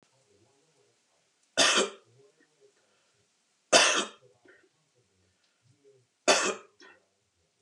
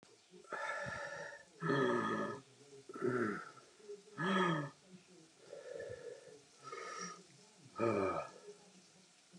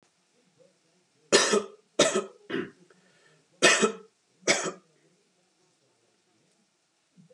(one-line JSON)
{"three_cough_length": "7.6 s", "three_cough_amplitude": 20774, "three_cough_signal_mean_std_ratio": 0.27, "exhalation_length": "9.4 s", "exhalation_amplitude": 2630, "exhalation_signal_mean_std_ratio": 0.57, "cough_length": "7.3 s", "cough_amplitude": 19035, "cough_signal_mean_std_ratio": 0.31, "survey_phase": "beta (2021-08-13 to 2022-03-07)", "age": "45-64", "gender": "Male", "wearing_mask": "No", "symptom_none": true, "smoker_status": "Never smoked", "respiratory_condition_asthma": false, "respiratory_condition_other": false, "recruitment_source": "REACT", "submission_delay": "6 days", "covid_test_result": "Negative", "covid_test_method": "RT-qPCR"}